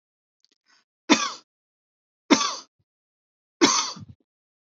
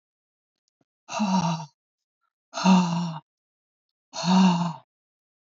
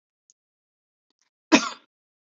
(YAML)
three_cough_length: 4.6 s
three_cough_amplitude: 24795
three_cough_signal_mean_std_ratio: 0.28
exhalation_length: 5.5 s
exhalation_amplitude: 13312
exhalation_signal_mean_std_ratio: 0.44
cough_length: 2.4 s
cough_amplitude: 28093
cough_signal_mean_std_ratio: 0.16
survey_phase: beta (2021-08-13 to 2022-03-07)
age: 45-64
gender: Female
wearing_mask: 'No'
symptom_none: true
smoker_status: Never smoked
respiratory_condition_asthma: false
respiratory_condition_other: false
recruitment_source: REACT
submission_delay: 3 days
covid_test_result: Negative
covid_test_method: RT-qPCR
influenza_a_test_result: Negative
influenza_b_test_result: Negative